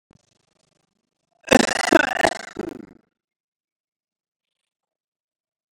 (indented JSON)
{
  "cough_length": "5.7 s",
  "cough_amplitude": 31490,
  "cough_signal_mean_std_ratio": 0.21,
  "survey_phase": "beta (2021-08-13 to 2022-03-07)",
  "age": "45-64",
  "gender": "Male",
  "wearing_mask": "No",
  "symptom_none": true,
  "smoker_status": "Ex-smoker",
  "respiratory_condition_asthma": false,
  "respiratory_condition_other": false,
  "recruitment_source": "REACT",
  "submission_delay": "1 day",
  "covid_test_result": "Negative",
  "covid_test_method": "RT-qPCR",
  "influenza_a_test_result": "Negative",
  "influenza_b_test_result": "Negative"
}